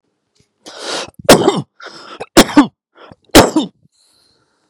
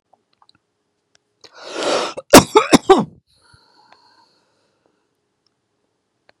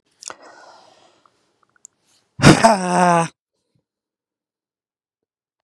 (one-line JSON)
{"three_cough_length": "4.7 s", "three_cough_amplitude": 32768, "three_cough_signal_mean_std_ratio": 0.34, "cough_length": "6.4 s", "cough_amplitude": 32768, "cough_signal_mean_std_ratio": 0.23, "exhalation_length": "5.6 s", "exhalation_amplitude": 32768, "exhalation_signal_mean_std_ratio": 0.26, "survey_phase": "beta (2021-08-13 to 2022-03-07)", "age": "18-44", "gender": "Male", "wearing_mask": "No", "symptom_none": true, "smoker_status": "Ex-smoker", "respiratory_condition_asthma": false, "respiratory_condition_other": false, "recruitment_source": "REACT", "submission_delay": "1 day", "covid_test_result": "Negative", "covid_test_method": "RT-qPCR", "influenza_a_test_result": "Negative", "influenza_b_test_result": "Negative"}